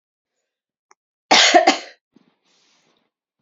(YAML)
cough_length: 3.4 s
cough_amplitude: 30670
cough_signal_mean_std_ratio: 0.28
survey_phase: alpha (2021-03-01 to 2021-08-12)
age: 18-44
gender: Female
wearing_mask: 'No'
symptom_cough_any: true
symptom_fatigue: true
symptom_fever_high_temperature: true
symptom_headache: true
symptom_onset: 3 days
smoker_status: Never smoked
respiratory_condition_asthma: false
respiratory_condition_other: false
recruitment_source: Test and Trace
submission_delay: 2 days
covid_test_result: Positive
covid_test_method: RT-qPCR
covid_ct_value: 19.5
covid_ct_gene: ORF1ab gene
covid_ct_mean: 20.6
covid_viral_load: 170000 copies/ml
covid_viral_load_category: Low viral load (10K-1M copies/ml)